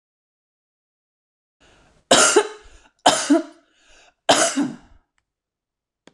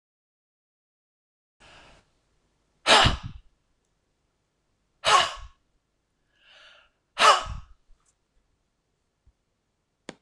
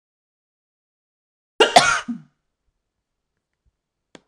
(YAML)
three_cough_length: 6.1 s
three_cough_amplitude: 26028
three_cough_signal_mean_std_ratio: 0.32
exhalation_length: 10.2 s
exhalation_amplitude: 21320
exhalation_signal_mean_std_ratio: 0.23
cough_length: 4.3 s
cough_amplitude: 26028
cough_signal_mean_std_ratio: 0.21
survey_phase: alpha (2021-03-01 to 2021-08-12)
age: 45-64
gender: Female
wearing_mask: 'No'
symptom_none: true
smoker_status: Never smoked
respiratory_condition_asthma: false
respiratory_condition_other: false
recruitment_source: Test and Trace
submission_delay: 3 days
covid_test_result: Negative
covid_test_method: LFT